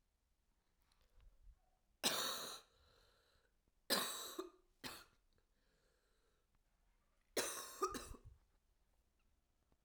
three_cough_length: 9.8 s
three_cough_amplitude: 2785
three_cough_signal_mean_std_ratio: 0.34
survey_phase: alpha (2021-03-01 to 2021-08-12)
age: 18-44
gender: Female
wearing_mask: 'No'
symptom_cough_any: true
symptom_diarrhoea: true
symptom_fatigue: true
symptom_fever_high_temperature: true
symptom_headache: true
smoker_status: Current smoker (e-cigarettes or vapes only)
respiratory_condition_asthma: false
respiratory_condition_other: false
recruitment_source: Test and Trace
submission_delay: 1 day
covid_test_result: Positive
covid_test_method: RT-qPCR
covid_ct_value: 17.2
covid_ct_gene: ORF1ab gene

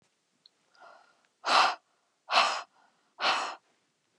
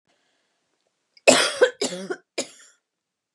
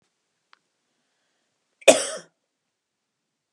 exhalation_length: 4.2 s
exhalation_amplitude: 11670
exhalation_signal_mean_std_ratio: 0.36
three_cough_length: 3.3 s
three_cough_amplitude: 29204
three_cough_signal_mean_std_ratio: 0.29
cough_length: 3.5 s
cough_amplitude: 29204
cough_signal_mean_std_ratio: 0.15
survey_phase: beta (2021-08-13 to 2022-03-07)
age: 45-64
gender: Female
wearing_mask: 'No'
symptom_cough_any: true
symptom_shortness_of_breath: true
smoker_status: Ex-smoker
respiratory_condition_asthma: false
respiratory_condition_other: false
recruitment_source: REACT
submission_delay: 4 days
covid_test_result: Negative
covid_test_method: RT-qPCR
influenza_a_test_result: Negative
influenza_b_test_result: Negative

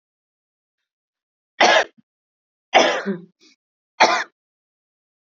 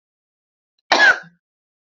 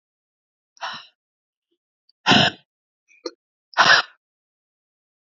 three_cough_length: 5.2 s
three_cough_amplitude: 31663
three_cough_signal_mean_std_ratio: 0.3
cough_length: 1.9 s
cough_amplitude: 32768
cough_signal_mean_std_ratio: 0.3
exhalation_length: 5.3 s
exhalation_amplitude: 26911
exhalation_signal_mean_std_ratio: 0.25
survey_phase: beta (2021-08-13 to 2022-03-07)
age: 18-44
gender: Female
wearing_mask: 'No'
symptom_cough_any: true
symptom_runny_or_blocked_nose: true
symptom_sore_throat: true
symptom_abdominal_pain: true
symptom_fatigue: true
symptom_headache: true
symptom_change_to_sense_of_smell_or_taste: true
smoker_status: Never smoked
respiratory_condition_asthma: false
respiratory_condition_other: false
recruitment_source: Test and Trace
submission_delay: 2 days
covid_test_result: Positive
covid_test_method: RT-qPCR
covid_ct_value: 18.1
covid_ct_gene: ORF1ab gene
covid_ct_mean: 18.7
covid_viral_load: 760000 copies/ml
covid_viral_load_category: Low viral load (10K-1M copies/ml)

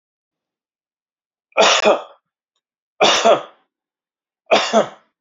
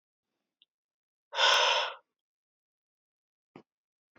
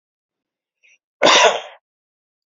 three_cough_length: 5.2 s
three_cough_amplitude: 29667
three_cough_signal_mean_std_ratio: 0.37
exhalation_length: 4.2 s
exhalation_amplitude: 8611
exhalation_signal_mean_std_ratio: 0.29
cough_length: 2.5 s
cough_amplitude: 32767
cough_signal_mean_std_ratio: 0.31
survey_phase: beta (2021-08-13 to 2022-03-07)
age: 18-44
gender: Male
wearing_mask: 'No'
symptom_new_continuous_cough: true
symptom_onset: 4 days
smoker_status: Ex-smoker
respiratory_condition_asthma: false
respiratory_condition_other: false
recruitment_source: Test and Trace
submission_delay: -1 day
covid_test_result: Negative
covid_test_method: RT-qPCR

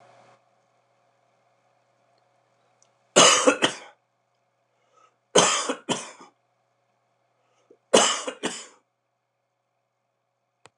three_cough_length: 10.8 s
three_cough_amplitude: 29124
three_cough_signal_mean_std_ratio: 0.26
survey_phase: beta (2021-08-13 to 2022-03-07)
age: 65+
gender: Male
wearing_mask: 'No'
symptom_cough_any: true
symptom_runny_or_blocked_nose: true
symptom_headache: true
symptom_change_to_sense_of_smell_or_taste: true
smoker_status: Never smoked
respiratory_condition_asthma: false
respiratory_condition_other: false
recruitment_source: Test and Trace
submission_delay: 2 days
covid_test_result: Positive
covid_test_method: RT-qPCR
covid_ct_value: 29.5
covid_ct_gene: ORF1ab gene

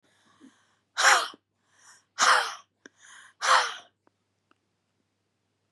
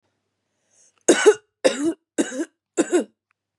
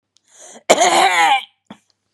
exhalation_length: 5.7 s
exhalation_amplitude: 15082
exhalation_signal_mean_std_ratio: 0.31
three_cough_length: 3.6 s
three_cough_amplitude: 27593
three_cough_signal_mean_std_ratio: 0.36
cough_length: 2.1 s
cough_amplitude: 32768
cough_signal_mean_std_ratio: 0.5
survey_phase: beta (2021-08-13 to 2022-03-07)
age: 18-44
gender: Female
wearing_mask: 'No'
symptom_none: true
smoker_status: Current smoker (1 to 10 cigarettes per day)
respiratory_condition_asthma: true
respiratory_condition_other: false
recruitment_source: REACT
submission_delay: 0 days
covid_test_result: Negative
covid_test_method: RT-qPCR
influenza_a_test_result: Negative
influenza_b_test_result: Negative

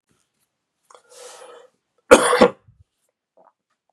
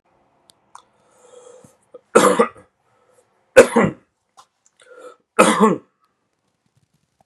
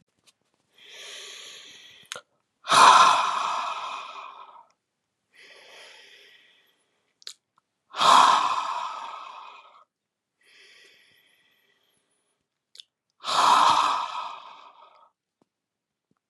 cough_length: 3.9 s
cough_amplitude: 32768
cough_signal_mean_std_ratio: 0.22
three_cough_length: 7.3 s
three_cough_amplitude: 32768
three_cough_signal_mean_std_ratio: 0.27
exhalation_length: 16.3 s
exhalation_amplitude: 27358
exhalation_signal_mean_std_ratio: 0.34
survey_phase: beta (2021-08-13 to 2022-03-07)
age: 45-64
gender: Male
wearing_mask: 'No'
symptom_cough_any: true
symptom_runny_or_blocked_nose: true
symptom_sore_throat: true
symptom_fatigue: true
symptom_onset: 4 days
smoker_status: Never smoked
respiratory_condition_asthma: false
respiratory_condition_other: false
recruitment_source: Test and Trace
submission_delay: 2 days
covid_test_result: Positive
covid_test_method: RT-qPCR
covid_ct_value: 24.2
covid_ct_gene: N gene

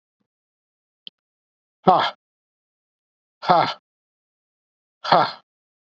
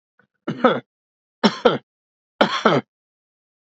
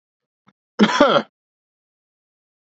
exhalation_length: 6.0 s
exhalation_amplitude: 32768
exhalation_signal_mean_std_ratio: 0.25
three_cough_length: 3.7 s
three_cough_amplitude: 32768
three_cough_signal_mean_std_ratio: 0.34
cough_length: 2.6 s
cough_amplitude: 29661
cough_signal_mean_std_ratio: 0.29
survey_phase: beta (2021-08-13 to 2022-03-07)
age: 45-64
gender: Male
wearing_mask: 'No'
symptom_cough_any: true
symptom_runny_or_blocked_nose: true
smoker_status: Never smoked
respiratory_condition_asthma: false
respiratory_condition_other: false
recruitment_source: Test and Trace
submission_delay: 2 days
covid_test_result: Positive
covid_test_method: RT-qPCR
covid_ct_value: 21.9
covid_ct_gene: ORF1ab gene
covid_ct_mean: 22.8
covid_viral_load: 34000 copies/ml
covid_viral_load_category: Low viral load (10K-1M copies/ml)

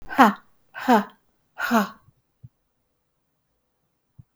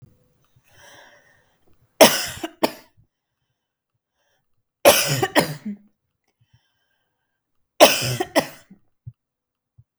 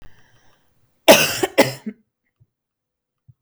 exhalation_length: 4.4 s
exhalation_amplitude: 31261
exhalation_signal_mean_std_ratio: 0.29
three_cough_length: 10.0 s
three_cough_amplitude: 32768
three_cough_signal_mean_std_ratio: 0.25
cough_length: 3.4 s
cough_amplitude: 32768
cough_signal_mean_std_ratio: 0.27
survey_phase: beta (2021-08-13 to 2022-03-07)
age: 45-64
gender: Female
wearing_mask: 'No'
symptom_runny_or_blocked_nose: true
symptom_fatigue: true
symptom_onset: 5 days
smoker_status: Ex-smoker
respiratory_condition_asthma: false
respiratory_condition_other: false
recruitment_source: REACT
submission_delay: 1 day
covid_test_result: Negative
covid_test_method: RT-qPCR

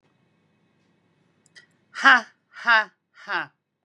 exhalation_length: 3.8 s
exhalation_amplitude: 25554
exhalation_signal_mean_std_ratio: 0.25
survey_phase: beta (2021-08-13 to 2022-03-07)
age: 45-64
gender: Female
wearing_mask: 'No'
symptom_none: true
smoker_status: Never smoked
respiratory_condition_asthma: false
respiratory_condition_other: false
recruitment_source: REACT
submission_delay: 2 days
covid_test_result: Negative
covid_test_method: RT-qPCR
influenza_a_test_result: Negative
influenza_b_test_result: Negative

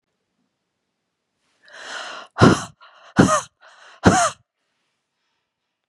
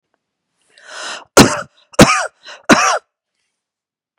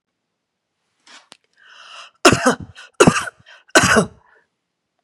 exhalation_length: 5.9 s
exhalation_amplitude: 32696
exhalation_signal_mean_std_ratio: 0.28
cough_length: 4.2 s
cough_amplitude: 32768
cough_signal_mean_std_ratio: 0.33
three_cough_length: 5.0 s
three_cough_amplitude: 32768
three_cough_signal_mean_std_ratio: 0.3
survey_phase: beta (2021-08-13 to 2022-03-07)
age: 45-64
gender: Female
wearing_mask: 'No'
symptom_none: true
smoker_status: Never smoked
respiratory_condition_asthma: false
respiratory_condition_other: false
recruitment_source: REACT
submission_delay: 5 days
covid_test_result: Negative
covid_test_method: RT-qPCR
influenza_a_test_result: Negative
influenza_b_test_result: Negative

